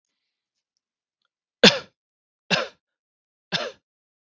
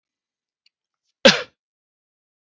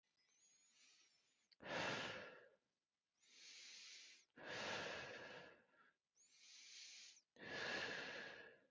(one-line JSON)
{"three_cough_length": "4.4 s", "three_cough_amplitude": 32767, "three_cough_signal_mean_std_ratio": 0.19, "cough_length": "2.6 s", "cough_amplitude": 32768, "cough_signal_mean_std_ratio": 0.16, "exhalation_length": "8.7 s", "exhalation_amplitude": 679, "exhalation_signal_mean_std_ratio": 0.57, "survey_phase": "beta (2021-08-13 to 2022-03-07)", "age": "18-44", "gender": "Male", "wearing_mask": "No", "symptom_none": true, "smoker_status": "Never smoked", "respiratory_condition_asthma": false, "respiratory_condition_other": false, "recruitment_source": "REACT", "submission_delay": "3 days", "covid_test_result": "Negative", "covid_test_method": "RT-qPCR", "influenza_a_test_result": "Negative", "influenza_b_test_result": "Negative"}